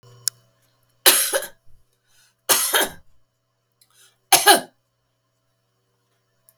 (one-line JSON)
{"three_cough_length": "6.6 s", "three_cough_amplitude": 32768, "three_cough_signal_mean_std_ratio": 0.28, "survey_phase": "beta (2021-08-13 to 2022-03-07)", "age": "65+", "gender": "Female", "wearing_mask": "No", "symptom_none": true, "smoker_status": "Ex-smoker", "respiratory_condition_asthma": false, "respiratory_condition_other": false, "recruitment_source": "REACT", "submission_delay": "2 days", "covid_test_result": "Negative", "covid_test_method": "RT-qPCR", "influenza_a_test_result": "Unknown/Void", "influenza_b_test_result": "Unknown/Void"}